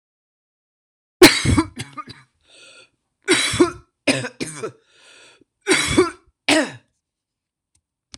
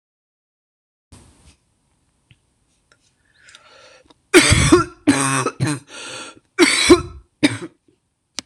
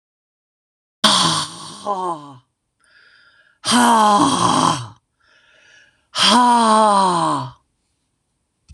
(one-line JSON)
{"three_cough_length": "8.2 s", "three_cough_amplitude": 26028, "three_cough_signal_mean_std_ratio": 0.34, "cough_length": "8.5 s", "cough_amplitude": 26028, "cough_signal_mean_std_ratio": 0.34, "exhalation_length": "8.7 s", "exhalation_amplitude": 26028, "exhalation_signal_mean_std_ratio": 0.52, "survey_phase": "beta (2021-08-13 to 2022-03-07)", "age": "65+", "gender": "Female", "wearing_mask": "No", "symptom_new_continuous_cough": true, "symptom_runny_or_blocked_nose": true, "symptom_sore_throat": true, "symptom_headache": true, "symptom_onset": "5 days", "smoker_status": "Never smoked", "respiratory_condition_asthma": false, "respiratory_condition_other": false, "recruitment_source": "Test and Trace", "submission_delay": "1 day", "covid_test_result": "Negative", "covid_test_method": "RT-qPCR"}